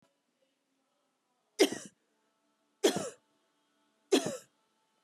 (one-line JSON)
{"three_cough_length": "5.0 s", "three_cough_amplitude": 9180, "three_cough_signal_mean_std_ratio": 0.24, "survey_phase": "beta (2021-08-13 to 2022-03-07)", "age": "45-64", "gender": "Female", "wearing_mask": "No", "symptom_none": true, "smoker_status": "Never smoked", "respiratory_condition_asthma": false, "respiratory_condition_other": false, "recruitment_source": "REACT", "submission_delay": "1 day", "covid_test_result": "Negative", "covid_test_method": "RT-qPCR", "influenza_a_test_result": "Negative", "influenza_b_test_result": "Negative"}